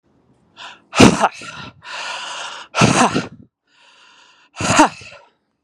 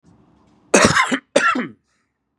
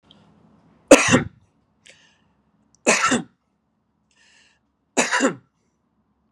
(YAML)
exhalation_length: 5.6 s
exhalation_amplitude: 32768
exhalation_signal_mean_std_ratio: 0.38
cough_length: 2.4 s
cough_amplitude: 32768
cough_signal_mean_std_ratio: 0.43
three_cough_length: 6.3 s
three_cough_amplitude: 32768
three_cough_signal_mean_std_ratio: 0.27
survey_phase: beta (2021-08-13 to 2022-03-07)
age: 45-64
gender: Male
wearing_mask: 'No'
symptom_none: true
smoker_status: Never smoked
respiratory_condition_asthma: false
respiratory_condition_other: false
recruitment_source: REACT
submission_delay: 1 day
covid_test_result: Negative
covid_test_method: RT-qPCR
influenza_a_test_result: Negative
influenza_b_test_result: Negative